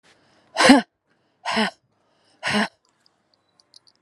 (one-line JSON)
{"exhalation_length": "4.0 s", "exhalation_amplitude": 32767, "exhalation_signal_mean_std_ratio": 0.29, "survey_phase": "alpha (2021-03-01 to 2021-08-12)", "age": "45-64", "gender": "Female", "wearing_mask": "No", "symptom_none": true, "smoker_status": "Ex-smoker", "respiratory_condition_asthma": false, "respiratory_condition_other": false, "recruitment_source": "REACT", "submission_delay": "2 days", "covid_test_result": "Negative", "covid_test_method": "RT-qPCR"}